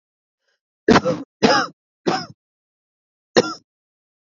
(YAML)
cough_length: 4.4 s
cough_amplitude: 31856
cough_signal_mean_std_ratio: 0.31
survey_phase: beta (2021-08-13 to 2022-03-07)
age: 18-44
gender: Female
wearing_mask: 'No'
symptom_cough_any: true
symptom_sore_throat: true
symptom_fatigue: true
symptom_onset: 12 days
smoker_status: Ex-smoker
respiratory_condition_asthma: true
respiratory_condition_other: false
recruitment_source: REACT
submission_delay: 8 days
covid_test_result: Negative
covid_test_method: RT-qPCR
influenza_a_test_result: Negative
influenza_b_test_result: Negative